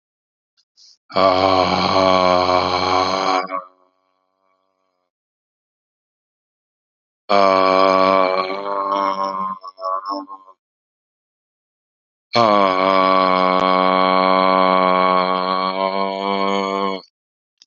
exhalation_length: 17.7 s
exhalation_amplitude: 31176
exhalation_signal_mean_std_ratio: 0.56
survey_phase: beta (2021-08-13 to 2022-03-07)
age: 65+
gender: Male
wearing_mask: 'No'
symptom_none: true
smoker_status: Never smoked
respiratory_condition_asthma: false
respiratory_condition_other: false
recruitment_source: REACT
submission_delay: 2 days
covid_test_result: Negative
covid_test_method: RT-qPCR
influenza_a_test_result: Negative
influenza_b_test_result: Negative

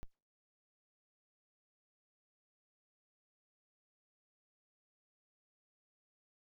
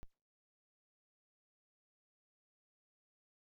exhalation_length: 6.6 s
exhalation_amplitude: 391
exhalation_signal_mean_std_ratio: 0.08
cough_length: 3.5 s
cough_amplitude: 259
cough_signal_mean_std_ratio: 0.11
survey_phase: beta (2021-08-13 to 2022-03-07)
age: 45-64
gender: Female
wearing_mask: 'No'
symptom_none: true
symptom_onset: 9 days
smoker_status: Current smoker (11 or more cigarettes per day)
respiratory_condition_asthma: true
respiratory_condition_other: false
recruitment_source: REACT
submission_delay: 1 day
covid_test_result: Negative
covid_test_method: RT-qPCR
influenza_a_test_result: Negative
influenza_b_test_result: Negative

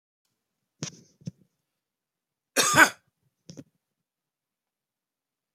cough_length: 5.5 s
cough_amplitude: 27862
cough_signal_mean_std_ratio: 0.18
survey_phase: alpha (2021-03-01 to 2021-08-12)
age: 65+
gender: Male
wearing_mask: 'No'
symptom_none: true
smoker_status: Never smoked
respiratory_condition_asthma: false
respiratory_condition_other: false
recruitment_source: REACT
submission_delay: 2 days
covid_test_result: Negative
covid_test_method: RT-qPCR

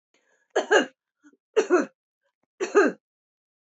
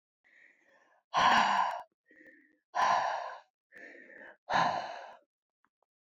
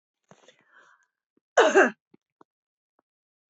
three_cough_length: 3.8 s
three_cough_amplitude: 16926
three_cough_signal_mean_std_ratio: 0.33
exhalation_length: 6.1 s
exhalation_amplitude: 7000
exhalation_signal_mean_std_ratio: 0.43
cough_length: 3.5 s
cough_amplitude: 20405
cough_signal_mean_std_ratio: 0.23
survey_phase: beta (2021-08-13 to 2022-03-07)
age: 45-64
gender: Female
wearing_mask: 'No'
symptom_none: true
smoker_status: Never smoked
respiratory_condition_asthma: true
respiratory_condition_other: false
recruitment_source: REACT
submission_delay: 3 days
covid_test_result: Negative
covid_test_method: RT-qPCR
influenza_a_test_result: Negative
influenza_b_test_result: Negative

